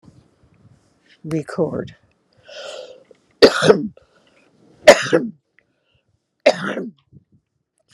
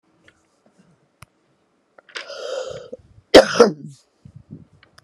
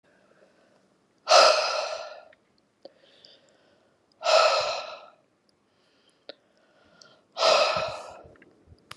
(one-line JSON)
{"three_cough_length": "7.9 s", "three_cough_amplitude": 32768, "three_cough_signal_mean_std_ratio": 0.28, "cough_length": "5.0 s", "cough_amplitude": 32768, "cough_signal_mean_std_ratio": 0.22, "exhalation_length": "9.0 s", "exhalation_amplitude": 23412, "exhalation_signal_mean_std_ratio": 0.35, "survey_phase": "beta (2021-08-13 to 2022-03-07)", "age": "65+", "gender": "Female", "wearing_mask": "No", "symptom_none": true, "symptom_onset": "12 days", "smoker_status": "Never smoked", "respiratory_condition_asthma": false, "respiratory_condition_other": false, "recruitment_source": "REACT", "submission_delay": "0 days", "covid_test_result": "Negative", "covid_test_method": "RT-qPCR"}